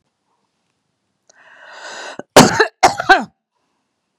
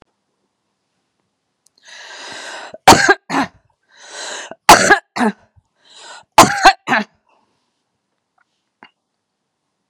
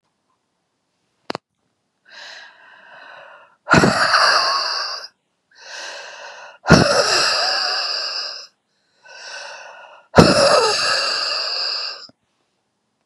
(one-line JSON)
{"cough_length": "4.2 s", "cough_amplitude": 32768, "cough_signal_mean_std_ratio": 0.28, "three_cough_length": "9.9 s", "three_cough_amplitude": 32768, "three_cough_signal_mean_std_ratio": 0.28, "exhalation_length": "13.1 s", "exhalation_amplitude": 32768, "exhalation_signal_mean_std_ratio": 0.48, "survey_phase": "beta (2021-08-13 to 2022-03-07)", "age": "65+", "gender": "Female", "wearing_mask": "No", "symptom_none": true, "smoker_status": "Never smoked", "respiratory_condition_asthma": false, "respiratory_condition_other": false, "recruitment_source": "REACT", "submission_delay": "1 day", "covid_test_result": "Negative", "covid_test_method": "RT-qPCR", "influenza_a_test_result": "Negative", "influenza_b_test_result": "Negative"}